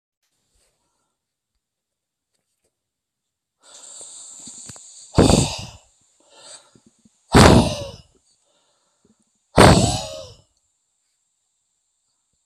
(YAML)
exhalation_length: 12.5 s
exhalation_amplitude: 32768
exhalation_signal_mean_std_ratio: 0.25
survey_phase: alpha (2021-03-01 to 2021-08-12)
age: 65+
gender: Male
wearing_mask: 'No'
symptom_none: true
smoker_status: Never smoked
respiratory_condition_asthma: false
respiratory_condition_other: false
recruitment_source: REACT
submission_delay: 1 day
covid_test_result: Negative
covid_test_method: RT-qPCR